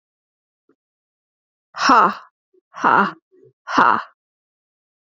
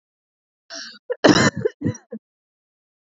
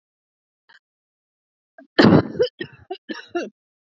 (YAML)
exhalation_length: 5.0 s
exhalation_amplitude: 32767
exhalation_signal_mean_std_ratio: 0.31
cough_length: 3.1 s
cough_amplitude: 27318
cough_signal_mean_std_ratio: 0.31
three_cough_length: 3.9 s
three_cough_amplitude: 32767
three_cough_signal_mean_std_ratio: 0.27
survey_phase: beta (2021-08-13 to 2022-03-07)
age: 18-44
gender: Female
wearing_mask: 'No'
symptom_runny_or_blocked_nose: true
symptom_fatigue: true
symptom_fever_high_temperature: true
symptom_headache: true
symptom_change_to_sense_of_smell_or_taste: true
symptom_other: true
symptom_onset: 3 days
smoker_status: Current smoker (11 or more cigarettes per day)
respiratory_condition_asthma: false
respiratory_condition_other: false
recruitment_source: Test and Trace
submission_delay: 2 days
covid_test_result: Positive
covid_test_method: RT-qPCR
covid_ct_value: 20.3
covid_ct_gene: ORF1ab gene